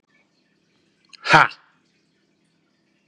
{
  "exhalation_length": "3.1 s",
  "exhalation_amplitude": 32767,
  "exhalation_signal_mean_std_ratio": 0.18,
  "survey_phase": "beta (2021-08-13 to 2022-03-07)",
  "age": "45-64",
  "gender": "Male",
  "wearing_mask": "No",
  "symptom_sore_throat": true,
  "smoker_status": "Ex-smoker",
  "respiratory_condition_asthma": true,
  "respiratory_condition_other": false,
  "recruitment_source": "REACT",
  "submission_delay": "3 days",
  "covid_test_result": "Negative",
  "covid_test_method": "RT-qPCR",
  "influenza_a_test_result": "Negative",
  "influenza_b_test_result": "Negative"
}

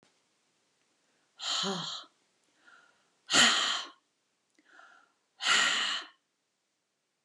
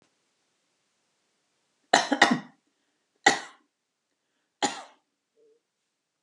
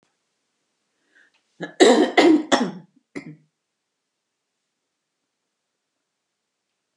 {
  "exhalation_length": "7.2 s",
  "exhalation_amplitude": 10487,
  "exhalation_signal_mean_std_ratio": 0.36,
  "three_cough_length": "6.2 s",
  "three_cough_amplitude": 31164,
  "three_cough_signal_mean_std_ratio": 0.21,
  "cough_length": "7.0 s",
  "cough_amplitude": 30363,
  "cough_signal_mean_std_ratio": 0.26,
  "survey_phase": "alpha (2021-03-01 to 2021-08-12)",
  "age": "45-64",
  "gender": "Female",
  "wearing_mask": "No",
  "symptom_none": true,
  "smoker_status": "Never smoked",
  "respiratory_condition_asthma": false,
  "respiratory_condition_other": false,
  "recruitment_source": "REACT",
  "submission_delay": "1 day",
  "covid_test_result": "Negative",
  "covid_test_method": "RT-qPCR"
}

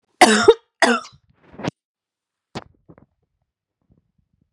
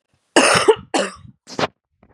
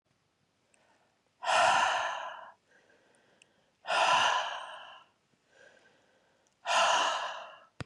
{
  "three_cough_length": "4.5 s",
  "three_cough_amplitude": 32768,
  "three_cough_signal_mean_std_ratio": 0.25,
  "cough_length": "2.1 s",
  "cough_amplitude": 32767,
  "cough_signal_mean_std_ratio": 0.42,
  "exhalation_length": "7.9 s",
  "exhalation_amplitude": 6990,
  "exhalation_signal_mean_std_ratio": 0.46,
  "survey_phase": "beta (2021-08-13 to 2022-03-07)",
  "age": "45-64",
  "gender": "Female",
  "wearing_mask": "No",
  "symptom_cough_any": true,
  "symptom_runny_or_blocked_nose": true,
  "symptom_shortness_of_breath": true,
  "symptom_fatigue": true,
  "symptom_headache": true,
  "symptom_change_to_sense_of_smell_or_taste": true,
  "symptom_onset": "4 days",
  "smoker_status": "Never smoked",
  "respiratory_condition_asthma": false,
  "respiratory_condition_other": false,
  "recruitment_source": "Test and Trace",
  "submission_delay": "2 days",
  "covid_test_result": "Positive",
  "covid_test_method": "RT-qPCR",
  "covid_ct_value": 23.2,
  "covid_ct_gene": "N gene"
}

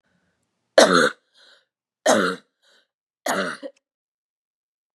{
  "three_cough_length": "4.9 s",
  "three_cough_amplitude": 32767,
  "three_cough_signal_mean_std_ratio": 0.3,
  "survey_phase": "beta (2021-08-13 to 2022-03-07)",
  "age": "18-44",
  "gender": "Female",
  "wearing_mask": "No",
  "symptom_cough_any": true,
  "symptom_runny_or_blocked_nose": true,
  "symptom_shortness_of_breath": true,
  "symptom_sore_throat": true,
  "symptom_fatigue": true,
  "symptom_headache": true,
  "symptom_change_to_sense_of_smell_or_taste": true,
  "symptom_loss_of_taste": true,
  "smoker_status": "Never smoked",
  "respiratory_condition_asthma": true,
  "respiratory_condition_other": false,
  "recruitment_source": "Test and Trace",
  "submission_delay": "2 days",
  "covid_test_result": "Positive",
  "covid_test_method": "RT-qPCR",
  "covid_ct_value": 15.2,
  "covid_ct_gene": "ORF1ab gene",
  "covid_ct_mean": 15.5,
  "covid_viral_load": "8200000 copies/ml",
  "covid_viral_load_category": "High viral load (>1M copies/ml)"
}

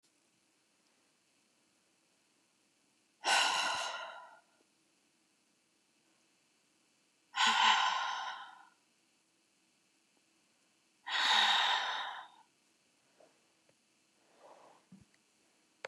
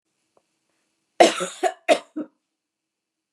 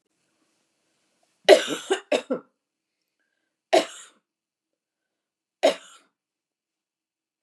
{
  "exhalation_length": "15.9 s",
  "exhalation_amplitude": 6078,
  "exhalation_signal_mean_std_ratio": 0.34,
  "cough_length": "3.3 s",
  "cough_amplitude": 30420,
  "cough_signal_mean_std_ratio": 0.25,
  "three_cough_length": "7.4 s",
  "three_cough_amplitude": 32177,
  "three_cough_signal_mean_std_ratio": 0.21,
  "survey_phase": "beta (2021-08-13 to 2022-03-07)",
  "age": "65+",
  "gender": "Female",
  "wearing_mask": "Yes",
  "symptom_sore_throat": true,
  "symptom_onset": "12 days",
  "smoker_status": "Never smoked",
  "respiratory_condition_asthma": false,
  "respiratory_condition_other": false,
  "recruitment_source": "REACT",
  "submission_delay": "1 day",
  "covid_test_result": "Negative",
  "covid_test_method": "RT-qPCR",
  "influenza_a_test_result": "Negative",
  "influenza_b_test_result": "Negative"
}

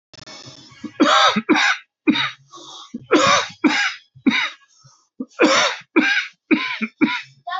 {
  "three_cough_length": "7.6 s",
  "three_cough_amplitude": 26024,
  "three_cough_signal_mean_std_ratio": 0.55,
  "survey_phase": "alpha (2021-03-01 to 2021-08-12)",
  "age": "45-64",
  "gender": "Male",
  "wearing_mask": "No",
  "symptom_cough_any": true,
  "symptom_shortness_of_breath": true,
  "symptom_fatigue": true,
  "symptom_onset": "12 days",
  "smoker_status": "Never smoked",
  "respiratory_condition_asthma": false,
  "respiratory_condition_other": false,
  "recruitment_source": "REACT",
  "submission_delay": "1 day",
  "covid_test_result": "Negative",
  "covid_test_method": "RT-qPCR"
}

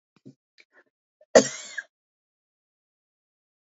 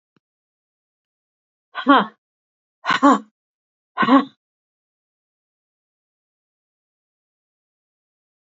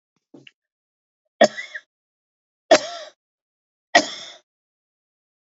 {
  "cough_length": "3.7 s",
  "cough_amplitude": 30872,
  "cough_signal_mean_std_ratio": 0.14,
  "exhalation_length": "8.4 s",
  "exhalation_amplitude": 28087,
  "exhalation_signal_mean_std_ratio": 0.22,
  "three_cough_length": "5.5 s",
  "three_cough_amplitude": 29286,
  "three_cough_signal_mean_std_ratio": 0.19,
  "survey_phase": "alpha (2021-03-01 to 2021-08-12)",
  "age": "45-64",
  "gender": "Female",
  "wearing_mask": "No",
  "symptom_none": true,
  "smoker_status": "Ex-smoker",
  "respiratory_condition_asthma": false,
  "respiratory_condition_other": false,
  "recruitment_source": "REACT",
  "submission_delay": "2 days",
  "covid_test_result": "Negative",
  "covid_test_method": "RT-qPCR"
}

